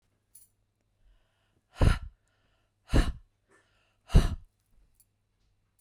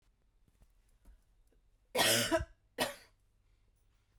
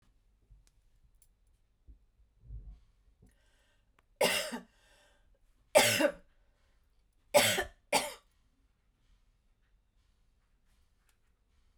{"exhalation_length": "5.8 s", "exhalation_amplitude": 12300, "exhalation_signal_mean_std_ratio": 0.24, "cough_length": "4.2 s", "cough_amplitude": 5261, "cough_signal_mean_std_ratio": 0.32, "three_cough_length": "11.8 s", "three_cough_amplitude": 11943, "three_cough_signal_mean_std_ratio": 0.25, "survey_phase": "beta (2021-08-13 to 2022-03-07)", "age": "45-64", "gender": "Female", "wearing_mask": "No", "symptom_fatigue": true, "symptom_headache": true, "symptom_other": true, "symptom_onset": "3 days", "smoker_status": "Prefer not to say", "respiratory_condition_asthma": false, "respiratory_condition_other": false, "recruitment_source": "REACT", "submission_delay": "1 day", "covid_test_result": "Negative", "covid_test_method": "RT-qPCR"}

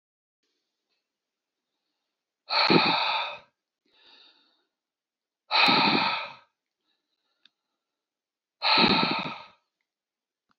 {"exhalation_length": "10.6 s", "exhalation_amplitude": 17236, "exhalation_signal_mean_std_ratio": 0.36, "survey_phase": "beta (2021-08-13 to 2022-03-07)", "age": "45-64", "gender": "Male", "wearing_mask": "No", "symptom_none": true, "smoker_status": "Never smoked", "respiratory_condition_asthma": false, "respiratory_condition_other": false, "recruitment_source": "REACT", "submission_delay": "3 days", "covid_test_result": "Negative", "covid_test_method": "RT-qPCR", "influenza_a_test_result": "Negative", "influenza_b_test_result": "Negative"}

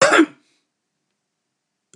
{"cough_length": "2.0 s", "cough_amplitude": 29892, "cough_signal_mean_std_ratio": 0.28, "survey_phase": "beta (2021-08-13 to 2022-03-07)", "age": "65+", "gender": "Male", "wearing_mask": "No", "symptom_none": true, "smoker_status": "Never smoked", "respiratory_condition_asthma": false, "respiratory_condition_other": false, "recruitment_source": "REACT", "submission_delay": "2 days", "covid_test_result": "Negative", "covid_test_method": "RT-qPCR", "influenza_a_test_result": "Negative", "influenza_b_test_result": "Negative"}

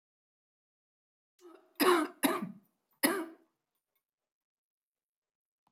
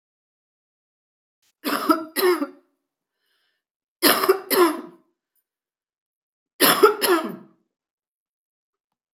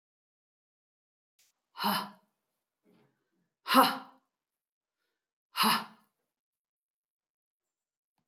{"cough_length": "5.7 s", "cough_amplitude": 9128, "cough_signal_mean_std_ratio": 0.28, "three_cough_length": "9.1 s", "three_cough_amplitude": 29268, "three_cough_signal_mean_std_ratio": 0.34, "exhalation_length": "8.3 s", "exhalation_amplitude": 11778, "exhalation_signal_mean_std_ratio": 0.22, "survey_phase": "beta (2021-08-13 to 2022-03-07)", "age": "45-64", "gender": "Female", "wearing_mask": "No", "symptom_cough_any": true, "symptom_runny_or_blocked_nose": true, "symptom_sore_throat": true, "symptom_fatigue": true, "symptom_headache": true, "symptom_change_to_sense_of_smell_or_taste": true, "symptom_onset": "8 days", "smoker_status": "Ex-smoker", "respiratory_condition_asthma": false, "respiratory_condition_other": false, "recruitment_source": "Test and Trace", "submission_delay": "2 days", "covid_test_result": "Positive", "covid_test_method": "RT-qPCR", "covid_ct_value": 18.6, "covid_ct_gene": "ORF1ab gene", "covid_ct_mean": 19.0, "covid_viral_load": "600000 copies/ml", "covid_viral_load_category": "Low viral load (10K-1M copies/ml)"}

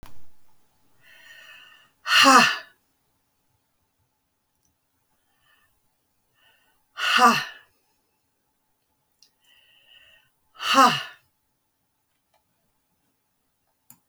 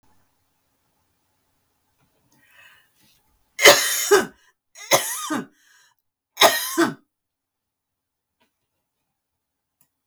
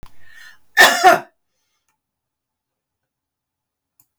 {"exhalation_length": "14.1 s", "exhalation_amplitude": 31077, "exhalation_signal_mean_std_ratio": 0.25, "three_cough_length": "10.1 s", "three_cough_amplitude": 32768, "three_cough_signal_mean_std_ratio": 0.26, "cough_length": "4.2 s", "cough_amplitude": 32768, "cough_signal_mean_std_ratio": 0.25, "survey_phase": "beta (2021-08-13 to 2022-03-07)", "age": "65+", "gender": "Female", "wearing_mask": "No", "symptom_none": true, "smoker_status": "Ex-smoker", "respiratory_condition_asthma": false, "respiratory_condition_other": false, "recruitment_source": "REACT", "submission_delay": "1 day", "covid_test_result": "Negative", "covid_test_method": "RT-qPCR"}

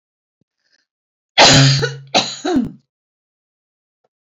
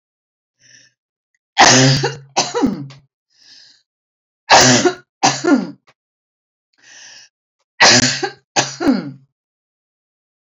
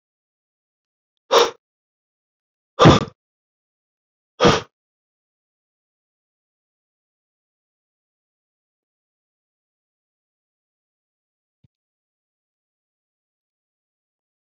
{"cough_length": "4.3 s", "cough_amplitude": 32767, "cough_signal_mean_std_ratio": 0.37, "three_cough_length": "10.4 s", "three_cough_amplitude": 32768, "three_cough_signal_mean_std_ratio": 0.39, "exhalation_length": "14.4 s", "exhalation_amplitude": 29376, "exhalation_signal_mean_std_ratio": 0.15, "survey_phase": "beta (2021-08-13 to 2022-03-07)", "age": "45-64", "gender": "Female", "wearing_mask": "No", "symptom_none": true, "smoker_status": "Never smoked", "respiratory_condition_asthma": false, "respiratory_condition_other": false, "recruitment_source": "REACT", "submission_delay": "2 days", "covid_test_result": "Negative", "covid_test_method": "RT-qPCR", "influenza_a_test_result": "Negative", "influenza_b_test_result": "Negative"}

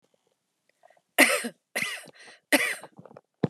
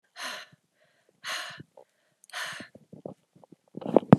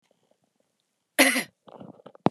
{"three_cough_length": "3.5 s", "three_cough_amplitude": 23132, "three_cough_signal_mean_std_ratio": 0.32, "exhalation_length": "4.2 s", "exhalation_amplitude": 31414, "exhalation_signal_mean_std_ratio": 0.19, "cough_length": "2.3 s", "cough_amplitude": 25041, "cough_signal_mean_std_ratio": 0.25, "survey_phase": "beta (2021-08-13 to 2022-03-07)", "age": "45-64", "gender": "Female", "wearing_mask": "No", "symptom_none": true, "smoker_status": "Ex-smoker", "respiratory_condition_asthma": false, "respiratory_condition_other": false, "recruitment_source": "REACT", "submission_delay": "3 days", "covid_test_result": "Negative", "covid_test_method": "RT-qPCR", "influenza_a_test_result": "Negative", "influenza_b_test_result": "Negative"}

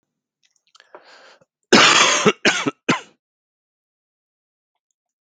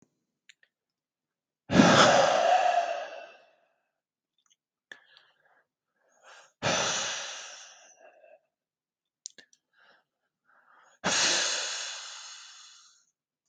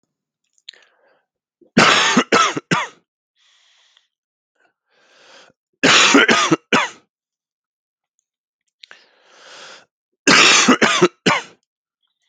{"cough_length": "5.2 s", "cough_amplitude": 32768, "cough_signal_mean_std_ratio": 0.32, "exhalation_length": "13.5 s", "exhalation_amplitude": 17830, "exhalation_signal_mean_std_ratio": 0.36, "three_cough_length": "12.3 s", "three_cough_amplitude": 32768, "three_cough_signal_mean_std_ratio": 0.37, "survey_phase": "beta (2021-08-13 to 2022-03-07)", "age": "45-64", "gender": "Male", "wearing_mask": "No", "symptom_cough_any": true, "symptom_runny_or_blocked_nose": true, "symptom_sore_throat": true, "symptom_onset": "3 days", "smoker_status": "Never smoked", "respiratory_condition_asthma": false, "respiratory_condition_other": false, "recruitment_source": "Test and Trace", "submission_delay": "1 day", "covid_test_result": "Negative", "covid_test_method": "LAMP"}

